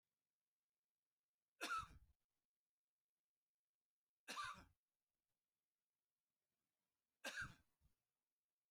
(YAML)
three_cough_length: 8.7 s
three_cough_amplitude: 567
three_cough_signal_mean_std_ratio: 0.25
survey_phase: beta (2021-08-13 to 2022-03-07)
age: 45-64
gender: Male
wearing_mask: 'No'
symptom_cough_any: true
symptom_fatigue: true
symptom_onset: 10 days
smoker_status: Never smoked
respiratory_condition_asthma: false
respiratory_condition_other: false
recruitment_source: REACT
submission_delay: 1 day
covid_test_result: Negative
covid_test_method: RT-qPCR
influenza_a_test_result: Unknown/Void
influenza_b_test_result: Unknown/Void